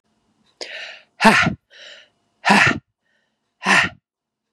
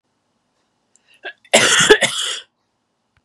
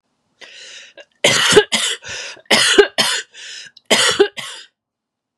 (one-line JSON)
{"exhalation_length": "4.5 s", "exhalation_amplitude": 32767, "exhalation_signal_mean_std_ratio": 0.36, "cough_length": "3.2 s", "cough_amplitude": 32768, "cough_signal_mean_std_ratio": 0.36, "three_cough_length": "5.4 s", "three_cough_amplitude": 32768, "three_cough_signal_mean_std_ratio": 0.46, "survey_phase": "beta (2021-08-13 to 2022-03-07)", "age": "45-64", "gender": "Female", "wearing_mask": "No", "symptom_cough_any": true, "symptom_runny_or_blocked_nose": true, "symptom_fatigue": true, "symptom_fever_high_temperature": true, "symptom_headache": true, "symptom_onset": "4 days", "smoker_status": "Never smoked", "respiratory_condition_asthma": false, "respiratory_condition_other": false, "recruitment_source": "Test and Trace", "submission_delay": "2 days", "covid_test_result": "Positive", "covid_test_method": "RT-qPCR", "covid_ct_value": 15.8, "covid_ct_gene": "ORF1ab gene", "covid_ct_mean": 16.3, "covid_viral_load": "4400000 copies/ml", "covid_viral_load_category": "High viral load (>1M copies/ml)"}